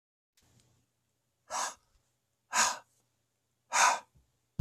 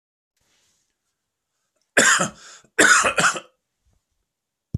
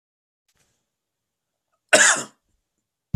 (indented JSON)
{
  "exhalation_length": "4.6 s",
  "exhalation_amplitude": 8804,
  "exhalation_signal_mean_std_ratio": 0.29,
  "three_cough_length": "4.8 s",
  "three_cough_amplitude": 28674,
  "three_cough_signal_mean_std_ratio": 0.34,
  "cough_length": "3.2 s",
  "cough_amplitude": 26754,
  "cough_signal_mean_std_ratio": 0.23,
  "survey_phase": "beta (2021-08-13 to 2022-03-07)",
  "age": "45-64",
  "gender": "Male",
  "wearing_mask": "No",
  "symptom_cough_any": true,
  "symptom_runny_or_blocked_nose": true,
  "symptom_shortness_of_breath": true,
  "symptom_fatigue": true,
  "symptom_headache": true,
  "smoker_status": "Never smoked",
  "respiratory_condition_asthma": false,
  "respiratory_condition_other": true,
  "recruitment_source": "Test and Trace",
  "submission_delay": "2 days",
  "covid_test_result": "Positive",
  "covid_test_method": "RT-qPCR",
  "covid_ct_value": 19.2,
  "covid_ct_gene": "N gene"
}